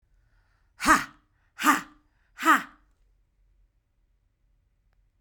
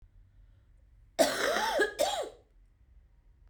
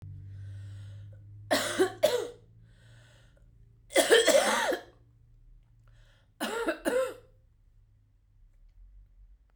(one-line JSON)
{"exhalation_length": "5.2 s", "exhalation_amplitude": 16253, "exhalation_signal_mean_std_ratio": 0.25, "cough_length": "3.5 s", "cough_amplitude": 8758, "cough_signal_mean_std_ratio": 0.46, "three_cough_length": "9.6 s", "three_cough_amplitude": 11488, "three_cough_signal_mean_std_ratio": 0.41, "survey_phase": "beta (2021-08-13 to 2022-03-07)", "age": "18-44", "gender": "Female", "wearing_mask": "No", "symptom_cough_any": true, "symptom_runny_or_blocked_nose": true, "symptom_shortness_of_breath": true, "symptom_fatigue": true, "symptom_headache": true, "symptom_change_to_sense_of_smell_or_taste": true, "symptom_onset": "2 days", "smoker_status": "Ex-smoker", "respiratory_condition_asthma": false, "respiratory_condition_other": false, "recruitment_source": "Test and Trace", "submission_delay": "2 days", "covid_test_result": "Positive", "covid_test_method": "RT-qPCR", "covid_ct_value": 16.2, "covid_ct_gene": "ORF1ab gene", "covid_ct_mean": 16.6, "covid_viral_load": "3700000 copies/ml", "covid_viral_load_category": "High viral load (>1M copies/ml)"}